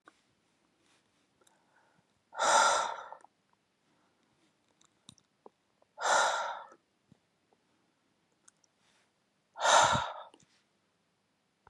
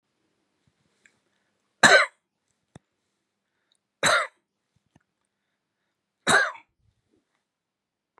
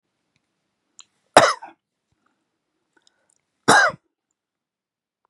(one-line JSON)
{"exhalation_length": "11.7 s", "exhalation_amplitude": 10077, "exhalation_signal_mean_std_ratio": 0.29, "three_cough_length": "8.2 s", "three_cough_amplitude": 29087, "three_cough_signal_mean_std_ratio": 0.21, "cough_length": "5.3 s", "cough_amplitude": 32768, "cough_signal_mean_std_ratio": 0.21, "survey_phase": "beta (2021-08-13 to 2022-03-07)", "age": "45-64", "gender": "Male", "wearing_mask": "No", "symptom_cough_any": true, "symptom_runny_or_blocked_nose": true, "symptom_shortness_of_breath": true, "symptom_sore_throat": true, "symptom_abdominal_pain": true, "symptom_fatigue": true, "symptom_headache": true, "symptom_change_to_sense_of_smell_or_taste": true, "smoker_status": "Never smoked", "respiratory_condition_asthma": false, "respiratory_condition_other": false, "recruitment_source": "Test and Trace", "submission_delay": "2 days", "covid_test_result": "Positive", "covid_test_method": "LFT"}